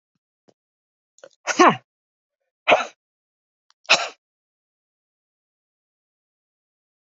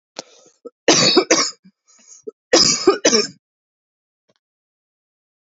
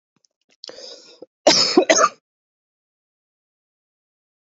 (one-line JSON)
{"exhalation_length": "7.2 s", "exhalation_amplitude": 29514, "exhalation_signal_mean_std_ratio": 0.19, "three_cough_length": "5.5 s", "three_cough_amplitude": 31730, "three_cough_signal_mean_std_ratio": 0.37, "cough_length": "4.5 s", "cough_amplitude": 27679, "cough_signal_mean_std_ratio": 0.28, "survey_phase": "beta (2021-08-13 to 2022-03-07)", "age": "45-64", "gender": "Female", "wearing_mask": "No", "symptom_cough_any": true, "symptom_runny_or_blocked_nose": true, "symptom_sore_throat": true, "symptom_fatigue": true, "symptom_fever_high_temperature": true, "symptom_headache": true, "smoker_status": "Current smoker (1 to 10 cigarettes per day)", "recruitment_source": "Test and Trace", "submission_delay": "1 day", "covid_test_result": "Positive", "covid_test_method": "ePCR"}